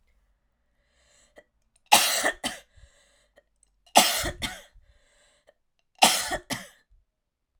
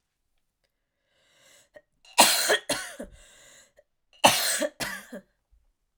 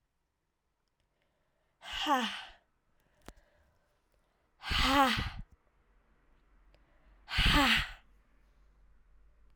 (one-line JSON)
{"three_cough_length": "7.6 s", "three_cough_amplitude": 30832, "three_cough_signal_mean_std_ratio": 0.29, "cough_length": "6.0 s", "cough_amplitude": 28344, "cough_signal_mean_std_ratio": 0.32, "exhalation_length": "9.6 s", "exhalation_amplitude": 7541, "exhalation_signal_mean_std_ratio": 0.34, "survey_phase": "alpha (2021-03-01 to 2021-08-12)", "age": "18-44", "gender": "Female", "wearing_mask": "No", "symptom_cough_any": true, "symptom_new_continuous_cough": true, "symptom_fatigue": true, "symptom_fever_high_temperature": true, "symptom_headache": true, "symptom_change_to_sense_of_smell_or_taste": true, "symptom_loss_of_taste": true, "symptom_onset": "7 days", "smoker_status": "Never smoked", "respiratory_condition_asthma": true, "respiratory_condition_other": false, "recruitment_source": "REACT", "submission_delay": "1 day", "covid_test_result": "Negative", "covid_test_method": "RT-qPCR"}